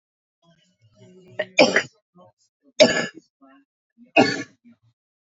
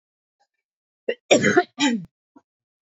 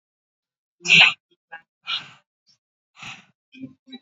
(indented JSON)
{
  "three_cough_length": "5.4 s",
  "three_cough_amplitude": 27637,
  "three_cough_signal_mean_std_ratio": 0.27,
  "cough_length": "2.9 s",
  "cough_amplitude": 26092,
  "cough_signal_mean_std_ratio": 0.34,
  "exhalation_length": "4.0 s",
  "exhalation_amplitude": 28704,
  "exhalation_signal_mean_std_ratio": 0.24,
  "survey_phase": "beta (2021-08-13 to 2022-03-07)",
  "age": "18-44",
  "gender": "Female",
  "wearing_mask": "No",
  "symptom_fatigue": true,
  "symptom_headache": true,
  "symptom_onset": "8 days",
  "smoker_status": "Ex-smoker",
  "respiratory_condition_asthma": false,
  "respiratory_condition_other": false,
  "recruitment_source": "REACT",
  "submission_delay": "1 day",
  "covid_test_result": "Negative",
  "covid_test_method": "RT-qPCR",
  "influenza_a_test_result": "Negative",
  "influenza_b_test_result": "Negative"
}